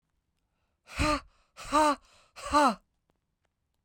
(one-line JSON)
{"exhalation_length": "3.8 s", "exhalation_amplitude": 8548, "exhalation_signal_mean_std_ratio": 0.37, "survey_phase": "beta (2021-08-13 to 2022-03-07)", "age": "45-64", "gender": "Female", "wearing_mask": "No", "symptom_none": true, "smoker_status": "Ex-smoker", "respiratory_condition_asthma": false, "respiratory_condition_other": false, "recruitment_source": "REACT", "submission_delay": "1 day", "covid_test_result": "Negative", "covid_test_method": "RT-qPCR"}